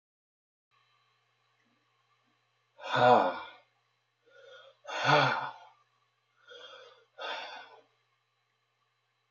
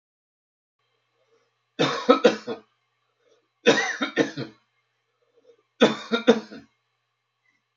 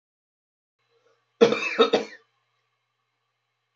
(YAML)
exhalation_length: 9.3 s
exhalation_amplitude: 9096
exhalation_signal_mean_std_ratio: 0.28
three_cough_length: 7.8 s
three_cough_amplitude: 27007
three_cough_signal_mean_std_ratio: 0.3
cough_length: 3.8 s
cough_amplitude: 23894
cough_signal_mean_std_ratio: 0.26
survey_phase: beta (2021-08-13 to 2022-03-07)
age: 65+
gender: Male
wearing_mask: 'No'
symptom_none: true
symptom_onset: 11 days
smoker_status: Ex-smoker
respiratory_condition_asthma: true
respiratory_condition_other: false
recruitment_source: REACT
submission_delay: 3 days
covid_test_result: Positive
covid_test_method: RT-qPCR
covid_ct_value: 26.0
covid_ct_gene: E gene
influenza_a_test_result: Negative
influenza_b_test_result: Negative